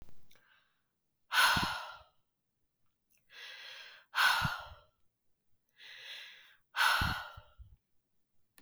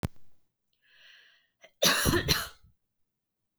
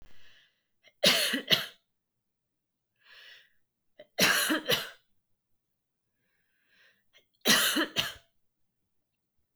{"exhalation_length": "8.6 s", "exhalation_amplitude": 5666, "exhalation_signal_mean_std_ratio": 0.37, "cough_length": "3.6 s", "cough_amplitude": 12206, "cough_signal_mean_std_ratio": 0.36, "three_cough_length": "9.6 s", "three_cough_amplitude": 17701, "three_cough_signal_mean_std_ratio": 0.34, "survey_phase": "beta (2021-08-13 to 2022-03-07)", "age": "18-44", "gender": "Female", "wearing_mask": "No", "symptom_none": true, "smoker_status": "Never smoked", "respiratory_condition_asthma": false, "respiratory_condition_other": false, "recruitment_source": "REACT", "submission_delay": "4 days", "covid_test_result": "Negative", "covid_test_method": "RT-qPCR", "influenza_a_test_result": "Negative", "influenza_b_test_result": "Negative"}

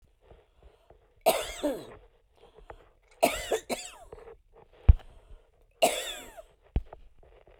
{"three_cough_length": "7.6 s", "three_cough_amplitude": 22542, "three_cough_signal_mean_std_ratio": 0.27, "survey_phase": "beta (2021-08-13 to 2022-03-07)", "age": "45-64", "gender": "Female", "wearing_mask": "No", "symptom_none": true, "smoker_status": "Ex-smoker", "respiratory_condition_asthma": false, "respiratory_condition_other": false, "recruitment_source": "REACT", "submission_delay": "3 days", "covid_test_result": "Negative", "covid_test_method": "RT-qPCR"}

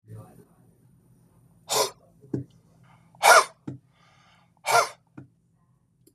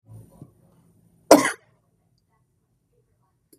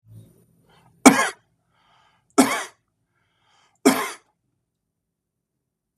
{"exhalation_length": "6.1 s", "exhalation_amplitude": 25796, "exhalation_signal_mean_std_ratio": 0.26, "cough_length": "3.6 s", "cough_amplitude": 32768, "cough_signal_mean_std_ratio": 0.17, "three_cough_length": "6.0 s", "three_cough_amplitude": 32768, "three_cough_signal_mean_std_ratio": 0.22, "survey_phase": "beta (2021-08-13 to 2022-03-07)", "age": "45-64", "gender": "Male", "wearing_mask": "No", "symptom_none": true, "symptom_onset": "6 days", "smoker_status": "Ex-smoker", "respiratory_condition_asthma": false, "respiratory_condition_other": false, "recruitment_source": "REACT", "submission_delay": "1 day", "covid_test_result": "Negative", "covid_test_method": "RT-qPCR", "influenza_a_test_result": "Unknown/Void", "influenza_b_test_result": "Unknown/Void"}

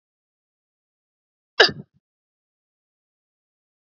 {"cough_length": "3.8 s", "cough_amplitude": 28110, "cough_signal_mean_std_ratio": 0.12, "survey_phase": "beta (2021-08-13 to 2022-03-07)", "age": "18-44", "gender": "Female", "wearing_mask": "No", "symptom_none": true, "smoker_status": "Current smoker (e-cigarettes or vapes only)", "respiratory_condition_asthma": true, "respiratory_condition_other": false, "recruitment_source": "Test and Trace", "submission_delay": "1 day", "covid_test_result": "Negative", "covid_test_method": "RT-qPCR"}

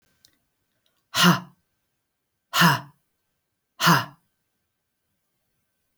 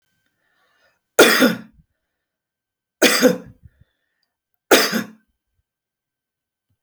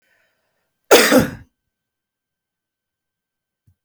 {"exhalation_length": "6.0 s", "exhalation_amplitude": 20533, "exhalation_signal_mean_std_ratio": 0.27, "three_cough_length": "6.8 s", "three_cough_amplitude": 32767, "three_cough_signal_mean_std_ratio": 0.29, "cough_length": "3.8 s", "cough_amplitude": 32768, "cough_signal_mean_std_ratio": 0.24, "survey_phase": "alpha (2021-03-01 to 2021-08-12)", "age": "45-64", "gender": "Female", "wearing_mask": "No", "symptom_none": true, "smoker_status": "Ex-smoker", "respiratory_condition_asthma": false, "respiratory_condition_other": false, "recruitment_source": "REACT", "submission_delay": "3 days", "covid_test_result": "Negative", "covid_test_method": "RT-qPCR"}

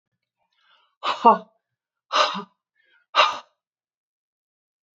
{"exhalation_length": "4.9 s", "exhalation_amplitude": 27384, "exhalation_signal_mean_std_ratio": 0.26, "survey_phase": "alpha (2021-03-01 to 2021-08-12)", "age": "45-64", "gender": "Female", "wearing_mask": "No", "symptom_fatigue": true, "symptom_onset": "13 days", "smoker_status": "Never smoked", "respiratory_condition_asthma": false, "respiratory_condition_other": false, "recruitment_source": "REACT", "submission_delay": "2 days", "covid_test_result": "Negative", "covid_test_method": "RT-qPCR"}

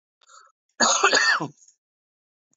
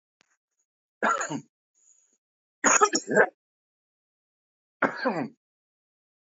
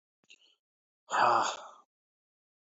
{"cough_length": "2.6 s", "cough_amplitude": 20608, "cough_signal_mean_std_ratio": 0.41, "three_cough_length": "6.3 s", "three_cough_amplitude": 18302, "three_cough_signal_mean_std_ratio": 0.31, "exhalation_length": "2.6 s", "exhalation_amplitude": 6629, "exhalation_signal_mean_std_ratio": 0.33, "survey_phase": "alpha (2021-03-01 to 2021-08-12)", "age": "45-64", "gender": "Male", "wearing_mask": "No", "symptom_cough_any": true, "symptom_new_continuous_cough": true, "symptom_shortness_of_breath": true, "symptom_fatigue": true, "symptom_headache": true, "symptom_onset": "2 days", "smoker_status": "Ex-smoker", "respiratory_condition_asthma": false, "respiratory_condition_other": false, "recruitment_source": "Test and Trace", "submission_delay": "2 days", "covid_test_result": "Positive", "covid_test_method": "RT-qPCR", "covid_ct_value": 27.3, "covid_ct_gene": "ORF1ab gene", "covid_ct_mean": 28.1, "covid_viral_load": "620 copies/ml", "covid_viral_load_category": "Minimal viral load (< 10K copies/ml)"}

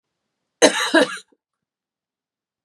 {"cough_length": "2.6 s", "cough_amplitude": 32514, "cough_signal_mean_std_ratio": 0.29, "survey_phase": "beta (2021-08-13 to 2022-03-07)", "age": "18-44", "gender": "Female", "wearing_mask": "No", "symptom_cough_any": true, "symptom_new_continuous_cough": true, "symptom_runny_or_blocked_nose": true, "symptom_shortness_of_breath": true, "symptom_diarrhoea": true, "symptom_fatigue": true, "symptom_headache": true, "symptom_onset": "4 days", "smoker_status": "Never smoked", "respiratory_condition_asthma": false, "respiratory_condition_other": false, "recruitment_source": "Test and Trace", "submission_delay": "2 days", "covid_test_result": "Positive", "covid_test_method": "RT-qPCR", "covid_ct_value": 20.4, "covid_ct_gene": "ORF1ab gene"}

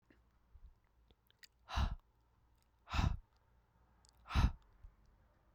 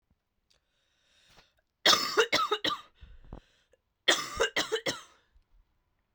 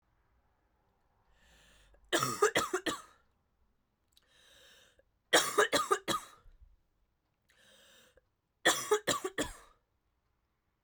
{"exhalation_length": "5.5 s", "exhalation_amplitude": 3543, "exhalation_signal_mean_std_ratio": 0.29, "cough_length": "6.1 s", "cough_amplitude": 13090, "cough_signal_mean_std_ratio": 0.35, "three_cough_length": "10.8 s", "three_cough_amplitude": 8449, "three_cough_signal_mean_std_ratio": 0.32, "survey_phase": "beta (2021-08-13 to 2022-03-07)", "age": "18-44", "gender": "Female", "wearing_mask": "No", "symptom_cough_any": true, "symptom_runny_or_blocked_nose": true, "symptom_shortness_of_breath": true, "symptom_sore_throat": true, "symptom_fatigue": true, "symptom_change_to_sense_of_smell_or_taste": true, "symptom_other": true, "symptom_onset": "2 days", "smoker_status": "Prefer not to say", "respiratory_condition_asthma": false, "respiratory_condition_other": false, "recruitment_source": "Test and Trace", "submission_delay": "1 day", "covid_test_result": "Positive", "covid_test_method": "RT-qPCR", "covid_ct_value": 19.2, "covid_ct_gene": "ORF1ab gene"}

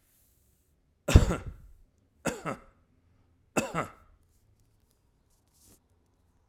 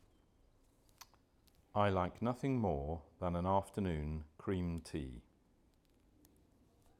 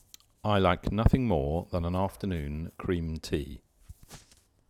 {"three_cough_length": "6.5 s", "three_cough_amplitude": 26246, "three_cough_signal_mean_std_ratio": 0.2, "exhalation_length": "7.0 s", "exhalation_amplitude": 3417, "exhalation_signal_mean_std_ratio": 0.52, "cough_length": "4.7 s", "cough_amplitude": 15014, "cough_signal_mean_std_ratio": 0.6, "survey_phase": "alpha (2021-03-01 to 2021-08-12)", "age": "45-64", "gender": "Male", "wearing_mask": "No", "symptom_none": true, "smoker_status": "Ex-smoker", "respiratory_condition_asthma": false, "respiratory_condition_other": false, "recruitment_source": "REACT", "submission_delay": "1 day", "covid_test_result": "Negative", "covid_test_method": "RT-qPCR"}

